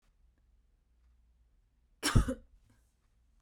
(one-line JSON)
{"cough_length": "3.4 s", "cough_amplitude": 9697, "cough_signal_mean_std_ratio": 0.22, "survey_phase": "beta (2021-08-13 to 2022-03-07)", "age": "18-44", "gender": "Female", "wearing_mask": "No", "symptom_runny_or_blocked_nose": true, "symptom_fever_high_temperature": true, "symptom_headache": true, "symptom_change_to_sense_of_smell_or_taste": true, "symptom_other": true, "symptom_onset": "4 days", "smoker_status": "Never smoked", "respiratory_condition_asthma": false, "respiratory_condition_other": false, "recruitment_source": "Test and Trace", "submission_delay": "2 days", "covid_test_result": "Positive", "covid_test_method": "RT-qPCR", "covid_ct_value": 18.4, "covid_ct_gene": "N gene", "covid_ct_mean": 19.4, "covid_viral_load": "440000 copies/ml", "covid_viral_load_category": "Low viral load (10K-1M copies/ml)"}